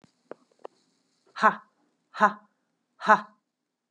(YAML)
exhalation_length: 3.9 s
exhalation_amplitude: 22552
exhalation_signal_mean_std_ratio: 0.22
survey_phase: beta (2021-08-13 to 2022-03-07)
age: 18-44
gender: Female
wearing_mask: 'No'
symptom_cough_any: true
symptom_runny_or_blocked_nose: true
symptom_fatigue: true
symptom_headache: true
symptom_change_to_sense_of_smell_or_taste: true
symptom_loss_of_taste: true
symptom_onset: 3 days
smoker_status: Never smoked
respiratory_condition_asthma: false
respiratory_condition_other: false
recruitment_source: Test and Trace
submission_delay: 1 day
covid_test_result: Positive
covid_test_method: RT-qPCR
covid_ct_value: 20.0
covid_ct_gene: ORF1ab gene
covid_ct_mean: 20.9
covid_viral_load: 140000 copies/ml
covid_viral_load_category: Low viral load (10K-1M copies/ml)